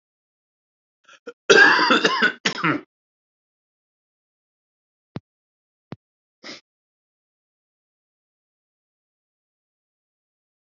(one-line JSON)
{"cough_length": "10.8 s", "cough_amplitude": 28784, "cough_signal_mean_std_ratio": 0.23, "survey_phase": "alpha (2021-03-01 to 2021-08-12)", "age": "45-64", "gender": "Male", "wearing_mask": "No", "symptom_cough_any": true, "symptom_diarrhoea": true, "symptom_fever_high_temperature": true, "symptom_headache": true, "symptom_onset": "3 days", "smoker_status": "Never smoked", "respiratory_condition_asthma": false, "respiratory_condition_other": false, "recruitment_source": "Test and Trace", "submission_delay": "2 days", "covid_test_result": "Positive", "covid_test_method": "RT-qPCR"}